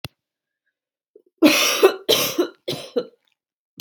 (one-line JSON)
{"three_cough_length": "3.8 s", "three_cough_amplitude": 32030, "three_cough_signal_mean_std_ratio": 0.39, "survey_phase": "beta (2021-08-13 to 2022-03-07)", "age": "18-44", "gender": "Female", "wearing_mask": "No", "symptom_none": true, "smoker_status": "Never smoked", "respiratory_condition_asthma": false, "respiratory_condition_other": false, "recruitment_source": "REACT", "submission_delay": "1 day", "covid_test_result": "Negative", "covid_test_method": "RT-qPCR", "influenza_a_test_result": "Unknown/Void", "influenza_b_test_result": "Unknown/Void"}